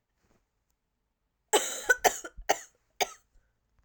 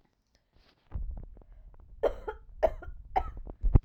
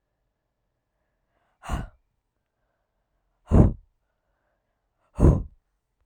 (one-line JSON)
{"cough_length": "3.8 s", "cough_amplitude": 14648, "cough_signal_mean_std_ratio": 0.27, "three_cough_length": "3.8 s", "three_cough_amplitude": 15659, "three_cough_signal_mean_std_ratio": 0.38, "exhalation_length": "6.1 s", "exhalation_amplitude": 25659, "exhalation_signal_mean_std_ratio": 0.22, "survey_phase": "alpha (2021-03-01 to 2021-08-12)", "age": "18-44", "gender": "Female", "wearing_mask": "No", "symptom_cough_any": true, "symptom_new_continuous_cough": true, "symptom_headache": true, "symptom_onset": "4 days", "smoker_status": "Never smoked", "respiratory_condition_asthma": false, "respiratory_condition_other": false, "recruitment_source": "Test and Trace", "submission_delay": "1 day", "covid_test_result": "Positive", "covid_test_method": "RT-qPCR", "covid_ct_value": 15.9, "covid_ct_gene": "ORF1ab gene", "covid_ct_mean": 17.0, "covid_viral_load": "2600000 copies/ml", "covid_viral_load_category": "High viral load (>1M copies/ml)"}